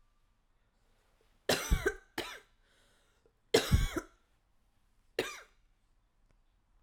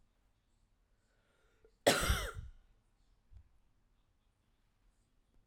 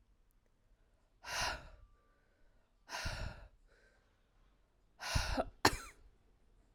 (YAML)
three_cough_length: 6.8 s
three_cough_amplitude: 8508
three_cough_signal_mean_std_ratio: 0.28
cough_length: 5.5 s
cough_amplitude: 7463
cough_signal_mean_std_ratio: 0.24
exhalation_length: 6.7 s
exhalation_amplitude: 8768
exhalation_signal_mean_std_ratio: 0.34
survey_phase: alpha (2021-03-01 to 2021-08-12)
age: 18-44
gender: Female
wearing_mask: 'No'
symptom_change_to_sense_of_smell_or_taste: true
symptom_loss_of_taste: true
symptom_onset: 2 days
smoker_status: Ex-smoker
respiratory_condition_asthma: false
respiratory_condition_other: false
recruitment_source: Test and Trace
submission_delay: 1 day
covid_test_result: Positive
covid_test_method: RT-qPCR
covid_ct_value: 17.2
covid_ct_gene: ORF1ab gene